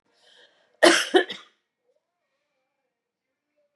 {"cough_length": "3.8 s", "cough_amplitude": 31044, "cough_signal_mean_std_ratio": 0.23, "survey_phase": "beta (2021-08-13 to 2022-03-07)", "age": "45-64", "gender": "Female", "wearing_mask": "No", "symptom_none": true, "smoker_status": "Ex-smoker", "respiratory_condition_asthma": false, "respiratory_condition_other": false, "recruitment_source": "REACT", "submission_delay": "1 day", "covid_test_result": "Negative", "covid_test_method": "RT-qPCR", "influenza_a_test_result": "Negative", "influenza_b_test_result": "Negative"}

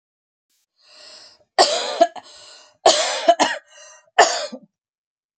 {"three_cough_length": "5.4 s", "three_cough_amplitude": 32767, "three_cough_signal_mean_std_ratio": 0.36, "survey_phase": "beta (2021-08-13 to 2022-03-07)", "age": "45-64", "gender": "Female", "wearing_mask": "No", "symptom_none": true, "smoker_status": "Ex-smoker", "respiratory_condition_asthma": false, "respiratory_condition_other": false, "recruitment_source": "REACT", "submission_delay": "1 day", "covid_test_result": "Negative", "covid_test_method": "RT-qPCR", "influenza_a_test_result": "Negative", "influenza_b_test_result": "Negative"}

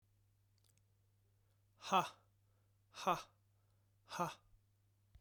{"exhalation_length": "5.2 s", "exhalation_amplitude": 2635, "exhalation_signal_mean_std_ratio": 0.26, "survey_phase": "beta (2021-08-13 to 2022-03-07)", "age": "18-44", "gender": "Male", "wearing_mask": "No", "symptom_none": true, "smoker_status": "Never smoked", "respiratory_condition_asthma": false, "respiratory_condition_other": false, "recruitment_source": "REACT", "submission_delay": "1 day", "covid_test_result": "Negative", "covid_test_method": "RT-qPCR"}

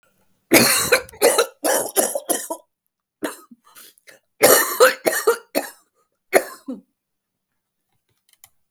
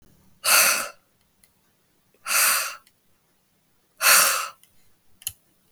{"cough_length": "8.7 s", "cough_amplitude": 32766, "cough_signal_mean_std_ratio": 0.39, "exhalation_length": "5.7 s", "exhalation_amplitude": 25715, "exhalation_signal_mean_std_ratio": 0.38, "survey_phase": "beta (2021-08-13 to 2022-03-07)", "age": "65+", "gender": "Male", "wearing_mask": "No", "symptom_cough_any": true, "symptom_new_continuous_cough": true, "symptom_runny_or_blocked_nose": true, "symptom_shortness_of_breath": true, "symptom_fever_high_temperature": true, "smoker_status": "Never smoked", "respiratory_condition_asthma": false, "respiratory_condition_other": false, "recruitment_source": "Test and Trace", "submission_delay": "1 day", "covid_test_result": "Negative", "covid_test_method": "RT-qPCR"}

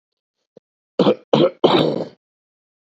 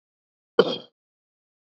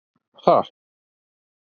{"three_cough_length": "2.8 s", "three_cough_amplitude": 32767, "three_cough_signal_mean_std_ratio": 0.39, "cough_length": "1.6 s", "cough_amplitude": 25760, "cough_signal_mean_std_ratio": 0.19, "exhalation_length": "1.7 s", "exhalation_amplitude": 27623, "exhalation_signal_mean_std_ratio": 0.23, "survey_phase": "beta (2021-08-13 to 2022-03-07)", "age": "18-44", "gender": "Male", "wearing_mask": "No", "symptom_cough_any": true, "symptom_runny_or_blocked_nose": true, "symptom_sore_throat": true, "symptom_fatigue": true, "symptom_headache": true, "symptom_onset": "3 days", "smoker_status": "Never smoked", "respiratory_condition_asthma": false, "respiratory_condition_other": false, "recruitment_source": "Test and Trace", "submission_delay": "2 days", "covid_test_result": "Positive", "covid_test_method": "RT-qPCR", "covid_ct_value": 32.3, "covid_ct_gene": "ORF1ab gene", "covid_ct_mean": 33.2, "covid_viral_load": "13 copies/ml", "covid_viral_load_category": "Minimal viral load (< 10K copies/ml)"}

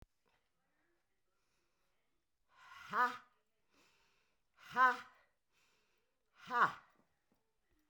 {"exhalation_length": "7.9 s", "exhalation_amplitude": 3796, "exhalation_signal_mean_std_ratio": 0.23, "survey_phase": "beta (2021-08-13 to 2022-03-07)", "age": "65+", "gender": "Female", "wearing_mask": "No", "symptom_cough_any": true, "symptom_onset": "12 days", "smoker_status": "Current smoker (1 to 10 cigarettes per day)", "respiratory_condition_asthma": false, "respiratory_condition_other": false, "recruitment_source": "REACT", "submission_delay": "3 days", "covid_test_result": "Negative", "covid_test_method": "RT-qPCR"}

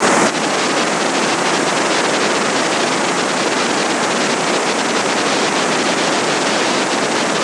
{"exhalation_length": "7.4 s", "exhalation_amplitude": 26027, "exhalation_signal_mean_std_ratio": 1.27, "survey_phase": "beta (2021-08-13 to 2022-03-07)", "age": "65+", "gender": "Female", "wearing_mask": "No", "symptom_cough_any": true, "symptom_runny_or_blocked_nose": true, "symptom_shortness_of_breath": true, "symptom_fatigue": true, "symptom_fever_high_temperature": true, "symptom_headache": true, "symptom_onset": "6 days", "smoker_status": "Never smoked", "respiratory_condition_asthma": false, "respiratory_condition_other": false, "recruitment_source": "Test and Trace", "submission_delay": "2 days", "covid_test_result": "Positive", "covid_test_method": "RT-qPCR", "covid_ct_value": 18.0, "covid_ct_gene": "ORF1ab gene"}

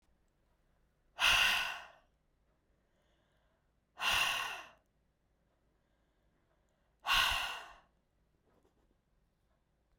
{"exhalation_length": "10.0 s", "exhalation_amplitude": 4968, "exhalation_signal_mean_std_ratio": 0.33, "survey_phase": "beta (2021-08-13 to 2022-03-07)", "age": "18-44", "gender": "Female", "wearing_mask": "No", "symptom_cough_any": true, "smoker_status": "Never smoked", "respiratory_condition_asthma": false, "respiratory_condition_other": false, "recruitment_source": "REACT", "submission_delay": "2 days", "covid_test_result": "Negative", "covid_test_method": "RT-qPCR"}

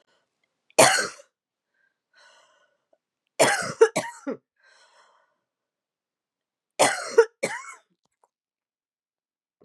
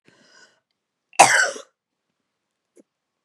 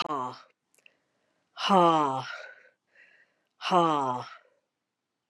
{"three_cough_length": "9.6 s", "three_cough_amplitude": 29235, "three_cough_signal_mean_std_ratio": 0.25, "cough_length": "3.2 s", "cough_amplitude": 32768, "cough_signal_mean_std_ratio": 0.23, "exhalation_length": "5.3 s", "exhalation_amplitude": 12847, "exhalation_signal_mean_std_ratio": 0.39, "survey_phase": "beta (2021-08-13 to 2022-03-07)", "age": "45-64", "gender": "Female", "wearing_mask": "No", "symptom_cough_any": true, "symptom_runny_or_blocked_nose": true, "symptom_sore_throat": true, "symptom_fatigue": true, "symptom_headache": true, "smoker_status": "Never smoked", "respiratory_condition_asthma": false, "respiratory_condition_other": false, "recruitment_source": "Test and Trace", "submission_delay": "1 day", "covid_test_method": "RT-qPCR"}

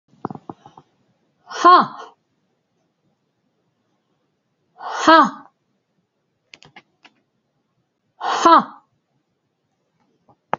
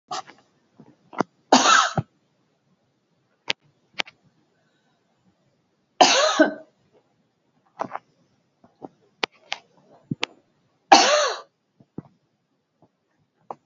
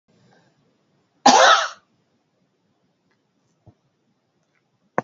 {"exhalation_length": "10.6 s", "exhalation_amplitude": 28365, "exhalation_signal_mean_std_ratio": 0.24, "three_cough_length": "13.7 s", "three_cough_amplitude": 32768, "three_cough_signal_mean_std_ratio": 0.25, "cough_length": "5.0 s", "cough_amplitude": 29603, "cough_signal_mean_std_ratio": 0.23, "survey_phase": "beta (2021-08-13 to 2022-03-07)", "age": "65+", "gender": "Female", "wearing_mask": "No", "symptom_none": true, "smoker_status": "Never smoked", "respiratory_condition_asthma": true, "respiratory_condition_other": false, "recruitment_source": "REACT", "submission_delay": "17 days", "covid_test_result": "Negative", "covid_test_method": "RT-qPCR", "influenza_a_test_result": "Negative", "influenza_b_test_result": "Negative"}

